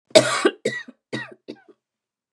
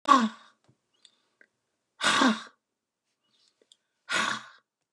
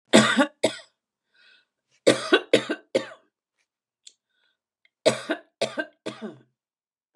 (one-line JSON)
{"cough_length": "2.3 s", "cough_amplitude": 32768, "cough_signal_mean_std_ratio": 0.32, "exhalation_length": "4.9 s", "exhalation_amplitude": 17056, "exhalation_signal_mean_std_ratio": 0.32, "three_cough_length": "7.2 s", "three_cough_amplitude": 31509, "three_cough_signal_mean_std_ratio": 0.3, "survey_phase": "beta (2021-08-13 to 2022-03-07)", "age": "65+", "gender": "Female", "wearing_mask": "No", "symptom_cough_any": true, "symptom_shortness_of_breath": true, "smoker_status": "Ex-smoker", "respiratory_condition_asthma": false, "respiratory_condition_other": true, "recruitment_source": "REACT", "submission_delay": "1 day", "covid_test_result": "Negative", "covid_test_method": "RT-qPCR", "influenza_a_test_result": "Unknown/Void", "influenza_b_test_result": "Unknown/Void"}